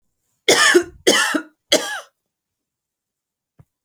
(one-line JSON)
{"three_cough_length": "3.8 s", "three_cough_amplitude": 32573, "three_cough_signal_mean_std_ratio": 0.37, "survey_phase": "beta (2021-08-13 to 2022-03-07)", "age": "18-44", "gender": "Female", "wearing_mask": "No", "symptom_none": true, "smoker_status": "Never smoked", "respiratory_condition_asthma": false, "respiratory_condition_other": false, "recruitment_source": "REACT", "submission_delay": "1 day", "covid_test_result": "Negative", "covid_test_method": "RT-qPCR"}